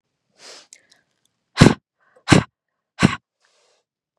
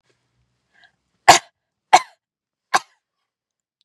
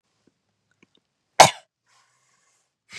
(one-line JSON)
{"exhalation_length": "4.2 s", "exhalation_amplitude": 32768, "exhalation_signal_mean_std_ratio": 0.21, "three_cough_length": "3.8 s", "three_cough_amplitude": 32768, "three_cough_signal_mean_std_ratio": 0.17, "cough_length": "3.0 s", "cough_amplitude": 32768, "cough_signal_mean_std_ratio": 0.13, "survey_phase": "beta (2021-08-13 to 2022-03-07)", "age": "18-44", "gender": "Female", "wearing_mask": "No", "symptom_none": true, "smoker_status": "Never smoked", "respiratory_condition_asthma": false, "respiratory_condition_other": false, "recruitment_source": "REACT", "submission_delay": "1 day", "covid_test_result": "Negative", "covid_test_method": "RT-qPCR", "influenza_a_test_result": "Negative", "influenza_b_test_result": "Negative"}